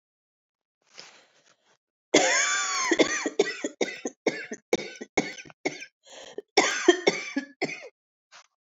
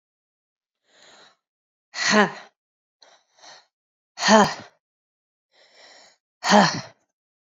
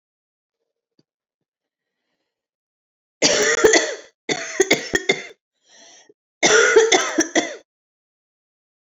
{"cough_length": "8.6 s", "cough_amplitude": 20725, "cough_signal_mean_std_ratio": 0.42, "exhalation_length": "7.4 s", "exhalation_amplitude": 28192, "exhalation_signal_mean_std_ratio": 0.27, "three_cough_length": "9.0 s", "three_cough_amplitude": 31290, "three_cough_signal_mean_std_ratio": 0.37, "survey_phase": "beta (2021-08-13 to 2022-03-07)", "age": "45-64", "gender": "Female", "wearing_mask": "No", "symptom_cough_any": true, "symptom_new_continuous_cough": true, "symptom_runny_or_blocked_nose": true, "symptom_fatigue": true, "symptom_fever_high_temperature": true, "symptom_headache": true, "symptom_onset": "4 days", "smoker_status": "Never smoked", "respiratory_condition_asthma": true, "respiratory_condition_other": false, "recruitment_source": "Test and Trace", "submission_delay": "2 days", "covid_test_result": "Positive", "covid_test_method": "RT-qPCR", "covid_ct_value": 22.6, "covid_ct_gene": "ORF1ab gene", "covid_ct_mean": 23.1, "covid_viral_load": "27000 copies/ml", "covid_viral_load_category": "Low viral load (10K-1M copies/ml)"}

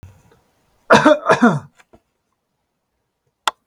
{"cough_length": "3.7 s", "cough_amplitude": 32768, "cough_signal_mean_std_ratio": 0.31, "survey_phase": "beta (2021-08-13 to 2022-03-07)", "age": "65+", "gender": "Male", "wearing_mask": "No", "symptom_none": true, "smoker_status": "Ex-smoker", "respiratory_condition_asthma": false, "respiratory_condition_other": false, "recruitment_source": "REACT", "submission_delay": "2 days", "covid_test_result": "Negative", "covid_test_method": "RT-qPCR", "influenza_a_test_result": "Negative", "influenza_b_test_result": "Negative"}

